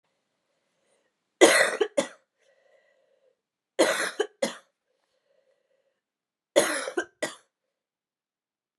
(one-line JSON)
{"three_cough_length": "8.8 s", "three_cough_amplitude": 26343, "three_cough_signal_mean_std_ratio": 0.27, "survey_phase": "beta (2021-08-13 to 2022-03-07)", "age": "18-44", "gender": "Female", "wearing_mask": "No", "symptom_cough_any": true, "symptom_runny_or_blocked_nose": true, "symptom_headache": true, "symptom_onset": "4 days", "smoker_status": "Ex-smoker", "respiratory_condition_asthma": false, "respiratory_condition_other": false, "recruitment_source": "Test and Trace", "submission_delay": "2 days", "covid_test_result": "Positive", "covid_test_method": "RT-qPCR", "covid_ct_value": 15.1, "covid_ct_gene": "ORF1ab gene"}